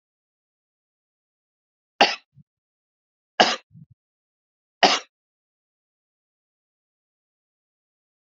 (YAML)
three_cough_length: 8.4 s
three_cough_amplitude: 30586
three_cough_signal_mean_std_ratio: 0.16
survey_phase: beta (2021-08-13 to 2022-03-07)
age: 18-44
gender: Male
wearing_mask: 'No'
symptom_none: true
smoker_status: Never smoked
respiratory_condition_asthma: false
respiratory_condition_other: false
recruitment_source: REACT
submission_delay: 2 days
covid_test_result: Negative
covid_test_method: RT-qPCR